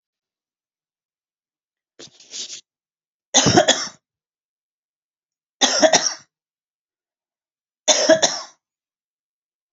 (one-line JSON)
{"three_cough_length": "9.7 s", "three_cough_amplitude": 32768, "three_cough_signal_mean_std_ratio": 0.28, "survey_phase": "beta (2021-08-13 to 2022-03-07)", "age": "45-64", "gender": "Female", "wearing_mask": "No", "symptom_none": true, "smoker_status": "Current smoker (e-cigarettes or vapes only)", "respiratory_condition_asthma": false, "respiratory_condition_other": false, "recruitment_source": "REACT", "submission_delay": "3 days", "covid_test_result": "Negative", "covid_test_method": "RT-qPCR", "influenza_a_test_result": "Negative", "influenza_b_test_result": "Negative"}